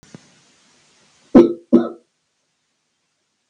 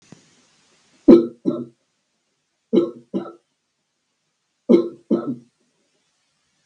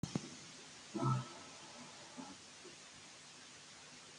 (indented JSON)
{
  "cough_length": "3.5 s",
  "cough_amplitude": 32768,
  "cough_signal_mean_std_ratio": 0.23,
  "three_cough_length": "6.7 s",
  "three_cough_amplitude": 32768,
  "three_cough_signal_mean_std_ratio": 0.25,
  "exhalation_length": "4.2 s",
  "exhalation_amplitude": 1965,
  "exhalation_signal_mean_std_ratio": 0.53,
  "survey_phase": "beta (2021-08-13 to 2022-03-07)",
  "age": "18-44",
  "gender": "Male",
  "wearing_mask": "No",
  "symptom_none": true,
  "smoker_status": "Ex-smoker",
  "respiratory_condition_asthma": false,
  "respiratory_condition_other": false,
  "recruitment_source": "REACT",
  "submission_delay": "1 day",
  "covid_test_result": "Negative",
  "covid_test_method": "RT-qPCR",
  "influenza_a_test_result": "Negative",
  "influenza_b_test_result": "Negative"
}